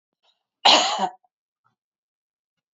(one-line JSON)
{"cough_length": "2.7 s", "cough_amplitude": 28062, "cough_signal_mean_std_ratio": 0.28, "survey_phase": "beta (2021-08-13 to 2022-03-07)", "age": "45-64", "gender": "Female", "wearing_mask": "No", "symptom_runny_or_blocked_nose": true, "smoker_status": "Never smoked", "respiratory_condition_asthma": false, "respiratory_condition_other": false, "recruitment_source": "REACT", "submission_delay": "1 day", "covid_test_result": "Negative", "covid_test_method": "RT-qPCR"}